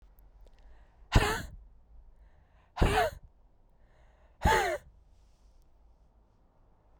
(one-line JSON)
{"exhalation_length": "7.0 s", "exhalation_amplitude": 12654, "exhalation_signal_mean_std_ratio": 0.32, "survey_phase": "beta (2021-08-13 to 2022-03-07)", "age": "18-44", "gender": "Male", "wearing_mask": "No", "symptom_cough_any": true, "symptom_runny_or_blocked_nose": true, "symptom_sore_throat": true, "symptom_abdominal_pain": true, "symptom_fatigue": true, "symptom_headache": true, "symptom_change_to_sense_of_smell_or_taste": true, "symptom_onset": "7 days", "smoker_status": "Ex-smoker", "respiratory_condition_asthma": false, "respiratory_condition_other": false, "recruitment_source": "Test and Trace", "submission_delay": "2 days", "covid_test_result": "Positive", "covid_test_method": "RT-qPCR", "covid_ct_value": 15.7, "covid_ct_gene": "ORF1ab gene"}